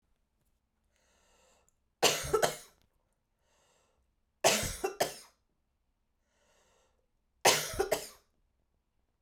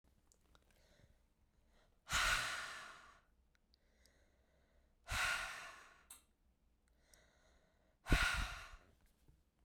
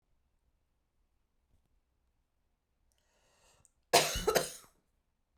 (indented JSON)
{
  "three_cough_length": "9.2 s",
  "three_cough_amplitude": 11171,
  "three_cough_signal_mean_std_ratio": 0.28,
  "exhalation_length": "9.6 s",
  "exhalation_amplitude": 3200,
  "exhalation_signal_mean_std_ratio": 0.35,
  "cough_length": "5.4 s",
  "cough_amplitude": 10591,
  "cough_signal_mean_std_ratio": 0.22,
  "survey_phase": "beta (2021-08-13 to 2022-03-07)",
  "age": "45-64",
  "gender": "Female",
  "wearing_mask": "No",
  "symptom_runny_or_blocked_nose": true,
  "symptom_sore_throat": true,
  "symptom_fatigue": true,
  "symptom_headache": true,
  "smoker_status": "Ex-smoker",
  "respiratory_condition_asthma": false,
  "respiratory_condition_other": false,
  "recruitment_source": "Test and Trace",
  "submission_delay": "0 days",
  "covid_test_result": "Positive",
  "covid_test_method": "LFT"
}